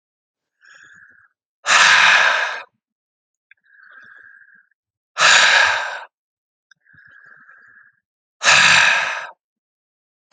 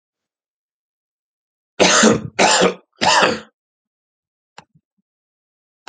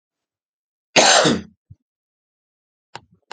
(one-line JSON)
{"exhalation_length": "10.3 s", "exhalation_amplitude": 32768, "exhalation_signal_mean_std_ratio": 0.4, "three_cough_length": "5.9 s", "three_cough_amplitude": 32410, "three_cough_signal_mean_std_ratio": 0.35, "cough_length": "3.3 s", "cough_amplitude": 31078, "cough_signal_mean_std_ratio": 0.29, "survey_phase": "alpha (2021-03-01 to 2021-08-12)", "age": "18-44", "gender": "Male", "wearing_mask": "No", "symptom_none": true, "symptom_onset": "9 days", "smoker_status": "Never smoked", "respiratory_condition_asthma": true, "respiratory_condition_other": false, "recruitment_source": "REACT", "submission_delay": "3 days", "covid_test_result": "Negative", "covid_test_method": "RT-qPCR"}